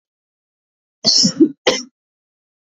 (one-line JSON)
{"cough_length": "2.7 s", "cough_amplitude": 31450, "cough_signal_mean_std_ratio": 0.34, "survey_phase": "alpha (2021-03-01 to 2021-08-12)", "age": "18-44", "gender": "Female", "wearing_mask": "No", "symptom_shortness_of_breath": true, "symptom_abdominal_pain": true, "symptom_fatigue": true, "symptom_change_to_sense_of_smell_or_taste": true, "symptom_onset": "4 days", "smoker_status": "Never smoked", "respiratory_condition_asthma": true, "respiratory_condition_other": false, "recruitment_source": "Test and Trace", "submission_delay": "2 days", "covid_test_result": "Positive", "covid_test_method": "RT-qPCR"}